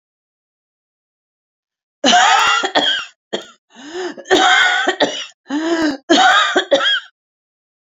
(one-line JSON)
{"cough_length": "7.9 s", "cough_amplitude": 32767, "cough_signal_mean_std_ratio": 0.55, "survey_phase": "beta (2021-08-13 to 2022-03-07)", "age": "65+", "gender": "Female", "wearing_mask": "No", "symptom_none": true, "smoker_status": "Never smoked", "respiratory_condition_asthma": false, "respiratory_condition_other": true, "recruitment_source": "REACT", "submission_delay": "34 days", "covid_test_result": "Negative", "covid_test_method": "RT-qPCR", "influenza_a_test_result": "Unknown/Void", "influenza_b_test_result": "Unknown/Void"}